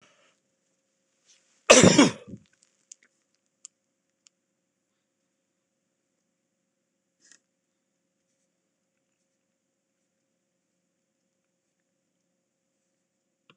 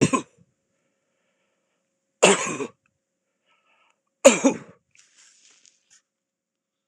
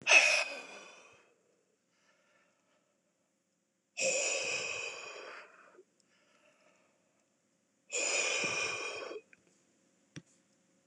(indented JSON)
{
  "cough_length": "13.6 s",
  "cough_amplitude": 26028,
  "cough_signal_mean_std_ratio": 0.13,
  "three_cough_length": "6.9 s",
  "three_cough_amplitude": 26028,
  "three_cough_signal_mean_std_ratio": 0.22,
  "exhalation_length": "10.9 s",
  "exhalation_amplitude": 11071,
  "exhalation_signal_mean_std_ratio": 0.37,
  "survey_phase": "beta (2021-08-13 to 2022-03-07)",
  "age": "65+",
  "gender": "Male",
  "wearing_mask": "No",
  "symptom_none": true,
  "smoker_status": "Never smoked",
  "respiratory_condition_asthma": false,
  "respiratory_condition_other": false,
  "recruitment_source": "REACT",
  "submission_delay": "2 days",
  "covid_test_result": "Negative",
  "covid_test_method": "RT-qPCR",
  "influenza_a_test_result": "Negative",
  "influenza_b_test_result": "Negative"
}